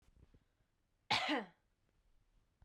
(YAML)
cough_length: 2.6 s
cough_amplitude: 2997
cough_signal_mean_std_ratio: 0.3
survey_phase: beta (2021-08-13 to 2022-03-07)
age: 18-44
gender: Female
wearing_mask: 'No'
symptom_runny_or_blocked_nose: true
symptom_sore_throat: true
symptom_fever_high_temperature: true
symptom_headache: true
smoker_status: Current smoker (e-cigarettes or vapes only)
respiratory_condition_asthma: false
respiratory_condition_other: false
recruitment_source: Test and Trace
submission_delay: 1 day
covid_test_result: Positive
covid_test_method: RT-qPCR